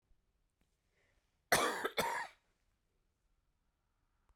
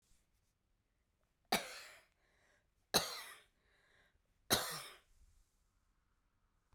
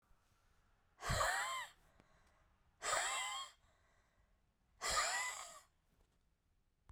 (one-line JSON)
{"cough_length": "4.4 s", "cough_amplitude": 5165, "cough_signal_mean_std_ratio": 0.29, "three_cough_length": "6.7 s", "three_cough_amplitude": 5218, "three_cough_signal_mean_std_ratio": 0.25, "exhalation_length": "6.9 s", "exhalation_amplitude": 2287, "exhalation_signal_mean_std_ratio": 0.46, "survey_phase": "beta (2021-08-13 to 2022-03-07)", "age": "45-64", "gender": "Female", "wearing_mask": "No", "symptom_cough_any": true, "symptom_runny_or_blocked_nose": true, "symptom_fatigue": true, "symptom_headache": true, "symptom_onset": "2 days", "smoker_status": "Never smoked", "respiratory_condition_asthma": true, "respiratory_condition_other": false, "recruitment_source": "Test and Trace", "submission_delay": "1 day", "covid_test_result": "Positive", "covid_test_method": "RT-qPCR", "covid_ct_value": 21.0, "covid_ct_gene": "ORF1ab gene", "covid_ct_mean": 21.5, "covid_viral_load": "86000 copies/ml", "covid_viral_load_category": "Low viral load (10K-1M copies/ml)"}